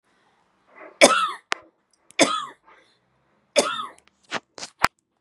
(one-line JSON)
{"three_cough_length": "5.2 s", "three_cough_amplitude": 32768, "three_cough_signal_mean_std_ratio": 0.28, "survey_phase": "beta (2021-08-13 to 2022-03-07)", "age": "18-44", "gender": "Female", "wearing_mask": "No", "symptom_none": true, "smoker_status": "Never smoked", "respiratory_condition_asthma": false, "respiratory_condition_other": false, "recruitment_source": "REACT", "submission_delay": "1 day", "covid_test_result": "Negative", "covid_test_method": "RT-qPCR"}